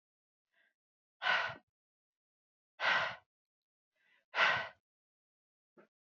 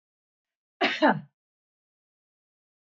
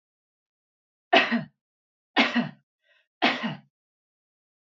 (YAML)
exhalation_length: 6.1 s
exhalation_amplitude: 5129
exhalation_signal_mean_std_ratio: 0.31
cough_length: 2.9 s
cough_amplitude: 14188
cough_signal_mean_std_ratio: 0.25
three_cough_length: 4.8 s
three_cough_amplitude: 19458
three_cough_signal_mean_std_ratio: 0.3
survey_phase: beta (2021-08-13 to 2022-03-07)
age: 45-64
gender: Female
wearing_mask: 'No'
symptom_none: true
smoker_status: Never smoked
respiratory_condition_asthma: false
respiratory_condition_other: false
recruitment_source: REACT
submission_delay: 3 days
covid_test_result: Negative
covid_test_method: RT-qPCR
influenza_a_test_result: Negative
influenza_b_test_result: Negative